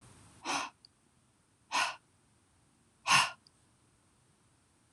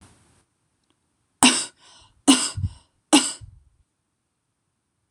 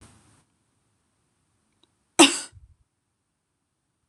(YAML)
exhalation_length: 4.9 s
exhalation_amplitude: 8485
exhalation_signal_mean_std_ratio: 0.28
three_cough_length: 5.1 s
three_cough_amplitude: 26028
three_cough_signal_mean_std_ratio: 0.26
cough_length: 4.1 s
cough_amplitude: 26023
cough_signal_mean_std_ratio: 0.15
survey_phase: beta (2021-08-13 to 2022-03-07)
age: 45-64
gender: Female
wearing_mask: 'No'
symptom_cough_any: true
symptom_fatigue: true
symptom_headache: true
symptom_onset: 2 days
smoker_status: Never smoked
respiratory_condition_asthma: false
respiratory_condition_other: false
recruitment_source: Test and Trace
submission_delay: 1 day
covid_test_result: Positive
covid_test_method: ePCR